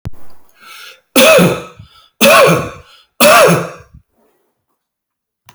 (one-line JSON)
{"three_cough_length": "5.5 s", "three_cough_amplitude": 32768, "three_cough_signal_mean_std_ratio": 0.48, "survey_phase": "beta (2021-08-13 to 2022-03-07)", "age": "65+", "gender": "Male", "wearing_mask": "No", "symptom_none": true, "smoker_status": "Never smoked", "respiratory_condition_asthma": false, "respiratory_condition_other": false, "recruitment_source": "REACT", "submission_delay": "1 day", "covid_test_result": "Negative", "covid_test_method": "RT-qPCR"}